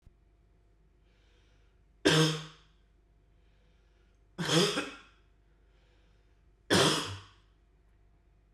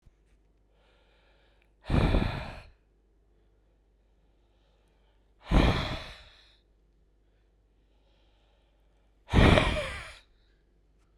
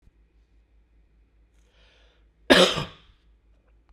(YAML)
three_cough_length: 8.5 s
three_cough_amplitude: 8949
three_cough_signal_mean_std_ratio: 0.32
exhalation_length: 11.2 s
exhalation_amplitude: 16568
exhalation_signal_mean_std_ratio: 0.29
cough_length: 3.9 s
cough_amplitude: 32767
cough_signal_mean_std_ratio: 0.22
survey_phase: beta (2021-08-13 to 2022-03-07)
age: 18-44
gender: Male
wearing_mask: 'No'
symptom_cough_any: true
symptom_runny_or_blocked_nose: true
symptom_fatigue: true
symptom_headache: true
smoker_status: Never smoked
respiratory_condition_asthma: false
respiratory_condition_other: false
recruitment_source: Test and Trace
submission_delay: -1 day
covid_test_result: Positive
covid_test_method: LFT